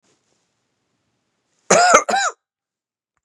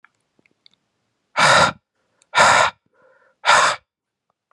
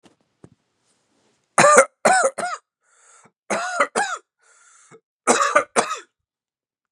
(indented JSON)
{
  "cough_length": "3.2 s",
  "cough_amplitude": 32768,
  "cough_signal_mean_std_ratio": 0.31,
  "exhalation_length": "4.5 s",
  "exhalation_amplitude": 31041,
  "exhalation_signal_mean_std_ratio": 0.38,
  "three_cough_length": "6.9 s",
  "three_cough_amplitude": 32768,
  "three_cough_signal_mean_std_ratio": 0.36,
  "survey_phase": "beta (2021-08-13 to 2022-03-07)",
  "age": "18-44",
  "gender": "Male",
  "wearing_mask": "No",
  "symptom_cough_any": true,
  "symptom_runny_or_blocked_nose": true,
  "symptom_sore_throat": true,
  "symptom_fatigue": true,
  "symptom_fever_high_temperature": true,
  "symptom_loss_of_taste": true,
  "smoker_status": "Never smoked",
  "respiratory_condition_asthma": false,
  "respiratory_condition_other": false,
  "recruitment_source": "Test and Trace",
  "submission_delay": "1 day",
  "covid_test_result": "Positive",
  "covid_test_method": "RT-qPCR",
  "covid_ct_value": 24.1,
  "covid_ct_gene": "ORF1ab gene"
}